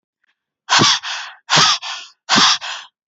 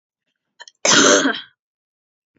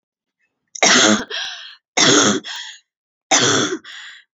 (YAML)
exhalation_length: 3.1 s
exhalation_amplitude: 30517
exhalation_signal_mean_std_ratio: 0.51
cough_length: 2.4 s
cough_amplitude: 32767
cough_signal_mean_std_ratio: 0.38
three_cough_length: 4.4 s
three_cough_amplitude: 32767
three_cough_signal_mean_std_ratio: 0.51
survey_phase: beta (2021-08-13 to 2022-03-07)
age: 18-44
gender: Female
wearing_mask: 'No'
symptom_none: true
smoker_status: Ex-smoker
respiratory_condition_asthma: false
respiratory_condition_other: false
recruitment_source: REACT
submission_delay: 4 days
covid_test_result: Negative
covid_test_method: RT-qPCR
influenza_a_test_result: Negative
influenza_b_test_result: Negative